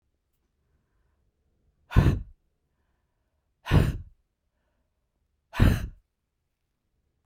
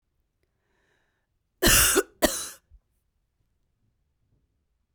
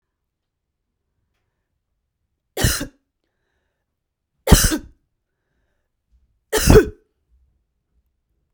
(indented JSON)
{
  "exhalation_length": "7.3 s",
  "exhalation_amplitude": 17405,
  "exhalation_signal_mean_std_ratio": 0.25,
  "cough_length": "4.9 s",
  "cough_amplitude": 18072,
  "cough_signal_mean_std_ratio": 0.27,
  "three_cough_length": "8.5 s",
  "three_cough_amplitude": 32768,
  "three_cough_signal_mean_std_ratio": 0.22,
  "survey_phase": "beta (2021-08-13 to 2022-03-07)",
  "age": "45-64",
  "gender": "Female",
  "wearing_mask": "No",
  "symptom_none": true,
  "smoker_status": "Never smoked",
  "respiratory_condition_asthma": false,
  "respiratory_condition_other": false,
  "recruitment_source": "REACT",
  "submission_delay": "2 days",
  "covid_test_result": "Negative",
  "covid_test_method": "RT-qPCR",
  "influenza_a_test_result": "Negative",
  "influenza_b_test_result": "Negative"
}